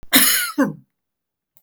{"cough_length": "1.6 s", "cough_amplitude": 32768, "cough_signal_mean_std_ratio": 0.45, "survey_phase": "beta (2021-08-13 to 2022-03-07)", "age": "65+", "gender": "Female", "wearing_mask": "No", "symptom_none": true, "smoker_status": "Never smoked", "respiratory_condition_asthma": false, "respiratory_condition_other": false, "recruitment_source": "REACT", "submission_delay": "1 day", "covid_test_result": "Negative", "covid_test_method": "RT-qPCR"}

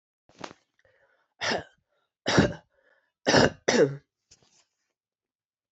{"three_cough_length": "5.7 s", "three_cough_amplitude": 18784, "three_cough_signal_mean_std_ratio": 0.3, "survey_phase": "beta (2021-08-13 to 2022-03-07)", "age": "45-64", "gender": "Female", "wearing_mask": "No", "symptom_runny_or_blocked_nose": true, "symptom_headache": true, "symptom_change_to_sense_of_smell_or_taste": true, "symptom_onset": "3 days", "smoker_status": "Ex-smoker", "respiratory_condition_asthma": false, "respiratory_condition_other": false, "recruitment_source": "Test and Trace", "submission_delay": "2 days", "covid_test_result": "Positive", "covid_test_method": "RT-qPCR", "covid_ct_value": 23.9, "covid_ct_gene": "ORF1ab gene", "covid_ct_mean": 24.2, "covid_viral_load": "11000 copies/ml", "covid_viral_load_category": "Low viral load (10K-1M copies/ml)"}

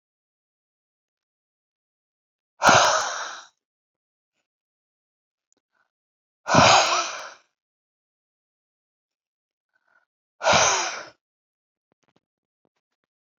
{"exhalation_length": "13.4 s", "exhalation_amplitude": 27181, "exhalation_signal_mean_std_ratio": 0.27, "survey_phase": "alpha (2021-03-01 to 2021-08-12)", "age": "65+", "gender": "Male", "wearing_mask": "No", "symptom_none": true, "smoker_status": "Ex-smoker", "respiratory_condition_asthma": false, "respiratory_condition_other": false, "recruitment_source": "REACT", "submission_delay": "2 days", "covid_test_result": "Negative", "covid_test_method": "RT-qPCR"}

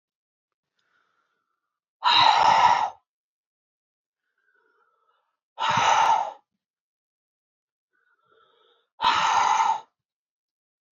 {"exhalation_length": "10.9 s", "exhalation_amplitude": 18042, "exhalation_signal_mean_std_ratio": 0.38, "survey_phase": "beta (2021-08-13 to 2022-03-07)", "age": "18-44", "gender": "Female", "wearing_mask": "No", "symptom_none": true, "smoker_status": "Never smoked", "respiratory_condition_asthma": false, "respiratory_condition_other": false, "recruitment_source": "REACT", "submission_delay": "2 days", "covid_test_result": "Negative", "covid_test_method": "RT-qPCR"}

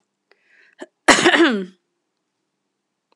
{"cough_length": "3.2 s", "cough_amplitude": 32768, "cough_signal_mean_std_ratio": 0.31, "survey_phase": "alpha (2021-03-01 to 2021-08-12)", "age": "45-64", "gender": "Female", "wearing_mask": "No", "symptom_cough_any": true, "symptom_fatigue": true, "symptom_headache": true, "smoker_status": "Ex-smoker", "respiratory_condition_asthma": false, "respiratory_condition_other": false, "recruitment_source": "Test and Trace", "submission_delay": "2 days", "covid_test_result": "Positive", "covid_test_method": "RT-qPCR"}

